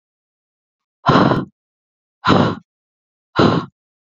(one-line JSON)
{"exhalation_length": "4.1 s", "exhalation_amplitude": 28706, "exhalation_signal_mean_std_ratio": 0.38, "survey_phase": "beta (2021-08-13 to 2022-03-07)", "age": "18-44", "gender": "Female", "wearing_mask": "No", "symptom_none": true, "smoker_status": "Never smoked", "respiratory_condition_asthma": false, "respiratory_condition_other": false, "recruitment_source": "REACT", "submission_delay": "1 day", "covid_test_result": "Negative", "covid_test_method": "RT-qPCR"}